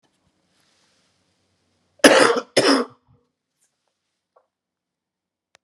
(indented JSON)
{
  "cough_length": "5.6 s",
  "cough_amplitude": 32768,
  "cough_signal_mean_std_ratio": 0.25,
  "survey_phase": "beta (2021-08-13 to 2022-03-07)",
  "age": "45-64",
  "gender": "Male",
  "wearing_mask": "No",
  "symptom_none": true,
  "smoker_status": "Current smoker (1 to 10 cigarettes per day)",
  "respiratory_condition_asthma": false,
  "respiratory_condition_other": false,
  "recruitment_source": "REACT",
  "submission_delay": "9 days",
  "covid_test_result": "Negative",
  "covid_test_method": "RT-qPCR"
}